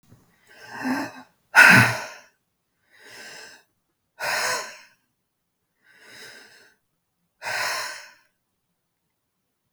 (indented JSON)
{
  "exhalation_length": "9.7 s",
  "exhalation_amplitude": 32768,
  "exhalation_signal_mean_std_ratio": 0.27,
  "survey_phase": "beta (2021-08-13 to 2022-03-07)",
  "age": "45-64",
  "gender": "Male",
  "wearing_mask": "No",
  "symptom_none": true,
  "smoker_status": "Ex-smoker",
  "respiratory_condition_asthma": false,
  "respiratory_condition_other": false,
  "recruitment_source": "REACT",
  "submission_delay": "2 days",
  "covid_test_result": "Negative",
  "covid_test_method": "RT-qPCR",
  "influenza_a_test_result": "Negative",
  "influenza_b_test_result": "Negative"
}